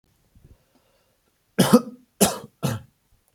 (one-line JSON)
{"three_cough_length": "3.3 s", "three_cough_amplitude": 28273, "three_cough_signal_mean_std_ratio": 0.27, "survey_phase": "beta (2021-08-13 to 2022-03-07)", "age": "18-44", "gender": "Male", "wearing_mask": "No", "symptom_none": true, "smoker_status": "Never smoked", "respiratory_condition_asthma": false, "respiratory_condition_other": false, "recruitment_source": "REACT", "submission_delay": "2 days", "covid_test_result": "Negative", "covid_test_method": "RT-qPCR"}